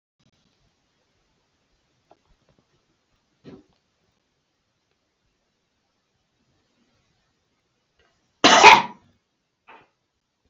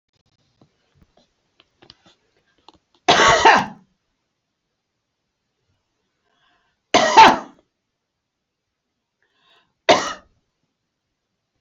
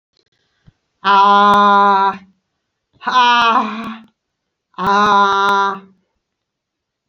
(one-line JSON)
{"cough_length": "10.5 s", "cough_amplitude": 29621, "cough_signal_mean_std_ratio": 0.15, "three_cough_length": "11.6 s", "three_cough_amplitude": 30197, "three_cough_signal_mean_std_ratio": 0.24, "exhalation_length": "7.1 s", "exhalation_amplitude": 28313, "exhalation_signal_mean_std_ratio": 0.56, "survey_phase": "beta (2021-08-13 to 2022-03-07)", "age": "65+", "gender": "Female", "wearing_mask": "No", "symptom_none": true, "smoker_status": "Never smoked", "respiratory_condition_asthma": true, "respiratory_condition_other": false, "recruitment_source": "REACT", "submission_delay": "2 days", "covid_test_result": "Negative", "covid_test_method": "RT-qPCR"}